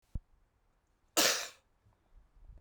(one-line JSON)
{"cough_length": "2.6 s", "cough_amplitude": 8580, "cough_signal_mean_std_ratio": 0.28, "survey_phase": "beta (2021-08-13 to 2022-03-07)", "age": "45-64", "gender": "Male", "wearing_mask": "No", "symptom_headache": true, "symptom_change_to_sense_of_smell_or_taste": true, "symptom_onset": "5 days", "smoker_status": "Prefer not to say", "respiratory_condition_asthma": false, "respiratory_condition_other": true, "recruitment_source": "Test and Trace", "submission_delay": "2 days", "covid_test_result": "Positive", "covid_test_method": "RT-qPCR"}